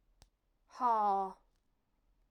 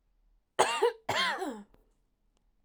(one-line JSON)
{"exhalation_length": "2.3 s", "exhalation_amplitude": 3189, "exhalation_signal_mean_std_ratio": 0.41, "cough_length": "2.6 s", "cough_amplitude": 15159, "cough_signal_mean_std_ratio": 0.42, "survey_phase": "alpha (2021-03-01 to 2021-08-12)", "age": "18-44", "gender": "Female", "wearing_mask": "No", "symptom_none": true, "smoker_status": "Never smoked", "respiratory_condition_asthma": false, "respiratory_condition_other": false, "recruitment_source": "REACT", "submission_delay": "2 days", "covid_test_result": "Negative", "covid_test_method": "RT-qPCR"}